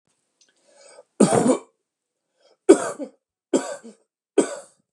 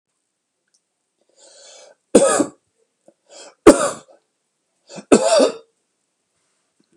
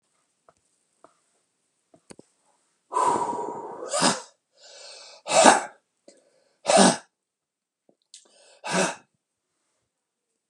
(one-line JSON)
{"cough_length": "4.9 s", "cough_amplitude": 32300, "cough_signal_mean_std_ratio": 0.29, "three_cough_length": "7.0 s", "three_cough_amplitude": 32768, "three_cough_signal_mean_std_ratio": 0.27, "exhalation_length": "10.5 s", "exhalation_amplitude": 32767, "exhalation_signal_mean_std_ratio": 0.3, "survey_phase": "beta (2021-08-13 to 2022-03-07)", "age": "45-64", "gender": "Male", "wearing_mask": "No", "symptom_none": true, "smoker_status": "Never smoked", "respiratory_condition_asthma": false, "respiratory_condition_other": false, "recruitment_source": "REACT", "submission_delay": "1 day", "covid_test_result": "Negative", "covid_test_method": "RT-qPCR", "influenza_a_test_result": "Negative", "influenza_b_test_result": "Negative"}